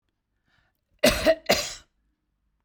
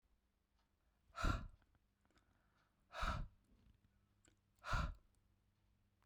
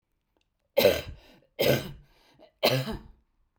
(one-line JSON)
{"cough_length": "2.6 s", "cough_amplitude": 17496, "cough_signal_mean_std_ratio": 0.32, "exhalation_length": "6.1 s", "exhalation_amplitude": 1607, "exhalation_signal_mean_std_ratio": 0.32, "three_cough_length": "3.6 s", "three_cough_amplitude": 14853, "three_cough_signal_mean_std_ratio": 0.37, "survey_phase": "beta (2021-08-13 to 2022-03-07)", "age": "45-64", "gender": "Female", "wearing_mask": "No", "symptom_none": true, "smoker_status": "Ex-smoker", "respiratory_condition_asthma": false, "respiratory_condition_other": false, "recruitment_source": "REACT", "submission_delay": "3 days", "covid_test_result": "Negative", "covid_test_method": "RT-qPCR"}